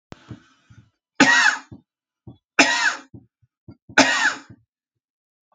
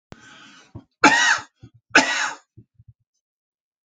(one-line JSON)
{"three_cough_length": "5.5 s", "three_cough_amplitude": 29614, "three_cough_signal_mean_std_ratio": 0.35, "cough_length": "3.9 s", "cough_amplitude": 31218, "cough_signal_mean_std_ratio": 0.32, "survey_phase": "alpha (2021-03-01 to 2021-08-12)", "age": "65+", "gender": "Male", "wearing_mask": "No", "symptom_cough_any": true, "smoker_status": "Ex-smoker", "respiratory_condition_asthma": false, "respiratory_condition_other": false, "recruitment_source": "REACT", "submission_delay": "8 days", "covid_test_result": "Negative", "covid_test_method": "RT-qPCR"}